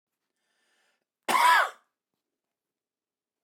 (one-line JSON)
{"cough_length": "3.4 s", "cough_amplitude": 10256, "cough_signal_mean_std_ratio": 0.28, "survey_phase": "beta (2021-08-13 to 2022-03-07)", "age": "45-64", "gender": "Male", "wearing_mask": "No", "symptom_none": true, "smoker_status": "Never smoked", "respiratory_condition_asthma": true, "respiratory_condition_other": false, "recruitment_source": "REACT", "submission_delay": "0 days", "covid_test_result": "Negative", "covid_test_method": "RT-qPCR"}